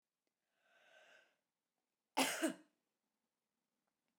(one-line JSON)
{"cough_length": "4.2 s", "cough_amplitude": 2811, "cough_signal_mean_std_ratio": 0.23, "survey_phase": "beta (2021-08-13 to 2022-03-07)", "age": "45-64", "gender": "Female", "wearing_mask": "No", "symptom_none": true, "smoker_status": "Never smoked", "respiratory_condition_asthma": false, "respiratory_condition_other": false, "recruitment_source": "REACT", "submission_delay": "8 days", "covid_test_result": "Negative", "covid_test_method": "RT-qPCR"}